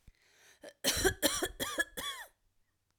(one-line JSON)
{"cough_length": "3.0 s", "cough_amplitude": 9431, "cough_signal_mean_std_ratio": 0.45, "survey_phase": "alpha (2021-03-01 to 2021-08-12)", "age": "45-64", "gender": "Female", "wearing_mask": "No", "symptom_none": true, "smoker_status": "Never smoked", "respiratory_condition_asthma": false, "respiratory_condition_other": false, "recruitment_source": "REACT", "submission_delay": "4 days", "covid_test_result": "Negative", "covid_test_method": "RT-qPCR"}